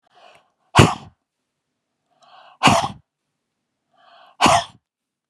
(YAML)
exhalation_length: 5.3 s
exhalation_amplitude: 32768
exhalation_signal_mean_std_ratio: 0.27
survey_phase: beta (2021-08-13 to 2022-03-07)
age: 45-64
gender: Female
wearing_mask: 'No'
symptom_fatigue: true
smoker_status: Ex-smoker
respiratory_condition_asthma: true
respiratory_condition_other: false
recruitment_source: REACT
submission_delay: 1 day
covid_test_result: Negative
covid_test_method: RT-qPCR
influenza_a_test_result: Unknown/Void
influenza_b_test_result: Unknown/Void